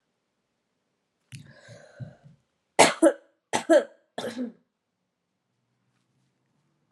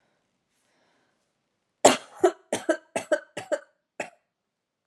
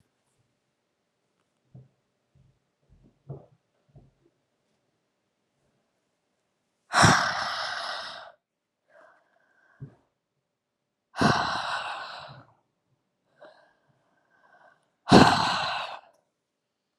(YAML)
three_cough_length: 6.9 s
three_cough_amplitude: 27710
three_cough_signal_mean_std_ratio: 0.23
cough_length: 4.9 s
cough_amplitude: 28862
cough_signal_mean_std_ratio: 0.24
exhalation_length: 17.0 s
exhalation_amplitude: 25700
exhalation_signal_mean_std_ratio: 0.26
survey_phase: alpha (2021-03-01 to 2021-08-12)
age: 18-44
gender: Female
wearing_mask: 'No'
symptom_cough_any: true
symptom_new_continuous_cough: true
symptom_shortness_of_breath: true
symptom_fatigue: true
symptom_fever_high_temperature: true
symptom_headache: true
symptom_onset: 3 days
smoker_status: Prefer not to say
respiratory_condition_asthma: false
respiratory_condition_other: false
recruitment_source: Test and Trace
submission_delay: 1 day
covid_test_result: Positive
covid_test_method: RT-qPCR
covid_ct_value: 16.0
covid_ct_gene: ORF1ab gene
covid_ct_mean: 16.4
covid_viral_load: 4000000 copies/ml
covid_viral_load_category: High viral load (>1M copies/ml)